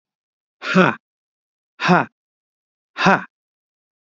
{"exhalation_length": "4.0 s", "exhalation_amplitude": 28713, "exhalation_signal_mean_std_ratio": 0.31, "survey_phase": "beta (2021-08-13 to 2022-03-07)", "age": "65+", "gender": "Male", "wearing_mask": "No", "symptom_none": true, "smoker_status": "Ex-smoker", "respiratory_condition_asthma": true, "respiratory_condition_other": false, "recruitment_source": "REACT", "submission_delay": "1 day", "covid_test_result": "Negative", "covid_test_method": "RT-qPCR", "influenza_a_test_result": "Negative", "influenza_b_test_result": "Negative"}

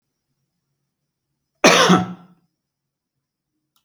{"cough_length": "3.8 s", "cough_amplitude": 29831, "cough_signal_mean_std_ratio": 0.27, "survey_phase": "alpha (2021-03-01 to 2021-08-12)", "age": "45-64", "gender": "Male", "wearing_mask": "No", "symptom_none": true, "smoker_status": "Never smoked", "respiratory_condition_asthma": false, "respiratory_condition_other": false, "recruitment_source": "REACT", "submission_delay": "2 days", "covid_test_result": "Negative", "covid_test_method": "RT-qPCR"}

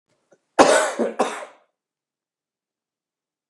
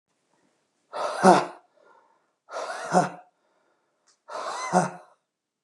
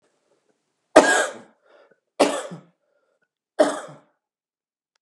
{"cough_length": "3.5 s", "cough_amplitude": 32768, "cough_signal_mean_std_ratio": 0.3, "exhalation_length": "5.6 s", "exhalation_amplitude": 30155, "exhalation_signal_mean_std_ratio": 0.32, "three_cough_length": "5.0 s", "three_cough_amplitude": 32768, "three_cough_signal_mean_std_ratio": 0.27, "survey_phase": "beta (2021-08-13 to 2022-03-07)", "age": "65+", "gender": "Male", "wearing_mask": "No", "symptom_cough_any": true, "smoker_status": "Never smoked", "respiratory_condition_asthma": false, "respiratory_condition_other": false, "recruitment_source": "Test and Trace", "submission_delay": "1 day", "covid_test_result": "Negative", "covid_test_method": "ePCR"}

